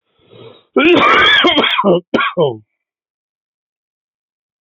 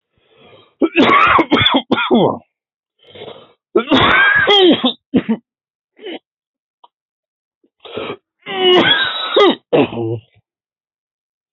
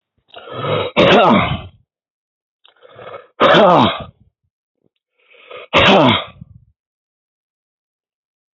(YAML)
cough_length: 4.6 s
cough_amplitude: 31049
cough_signal_mean_std_ratio: 0.51
three_cough_length: 11.5 s
three_cough_amplitude: 30012
three_cough_signal_mean_std_ratio: 0.51
exhalation_length: 8.5 s
exhalation_amplitude: 31488
exhalation_signal_mean_std_ratio: 0.4
survey_phase: beta (2021-08-13 to 2022-03-07)
age: 45-64
gender: Male
wearing_mask: 'No'
symptom_none: true
smoker_status: Never smoked
respiratory_condition_asthma: true
respiratory_condition_other: false
recruitment_source: REACT
submission_delay: 1 day
covid_test_result: Negative
covid_test_method: RT-qPCR